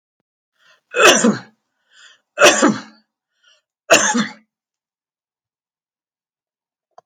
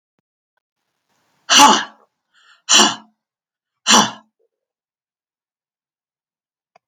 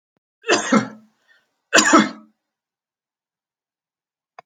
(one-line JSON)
{"three_cough_length": "7.1 s", "three_cough_amplitude": 32291, "three_cough_signal_mean_std_ratio": 0.31, "exhalation_length": "6.9 s", "exhalation_amplitude": 32768, "exhalation_signal_mean_std_ratio": 0.26, "cough_length": "4.5 s", "cough_amplitude": 31710, "cough_signal_mean_std_ratio": 0.29, "survey_phase": "beta (2021-08-13 to 2022-03-07)", "age": "65+", "gender": "Female", "wearing_mask": "No", "symptom_none": true, "smoker_status": "Never smoked", "respiratory_condition_asthma": false, "respiratory_condition_other": false, "recruitment_source": "REACT", "submission_delay": "1 day", "covid_test_result": "Negative", "covid_test_method": "RT-qPCR"}